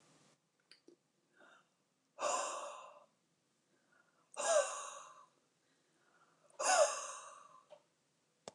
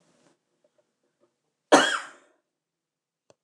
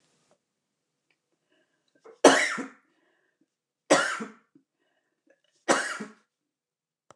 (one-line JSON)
{"exhalation_length": "8.5 s", "exhalation_amplitude": 3948, "exhalation_signal_mean_std_ratio": 0.33, "cough_length": "3.4 s", "cough_amplitude": 26182, "cough_signal_mean_std_ratio": 0.2, "three_cough_length": "7.2 s", "three_cough_amplitude": 26495, "three_cough_signal_mean_std_ratio": 0.24, "survey_phase": "beta (2021-08-13 to 2022-03-07)", "age": "65+", "gender": "Female", "wearing_mask": "No", "symptom_none": true, "smoker_status": "Never smoked", "respiratory_condition_asthma": true, "respiratory_condition_other": false, "recruitment_source": "REACT", "submission_delay": "1 day", "covid_test_result": "Negative", "covid_test_method": "RT-qPCR", "influenza_a_test_result": "Negative", "influenza_b_test_result": "Negative"}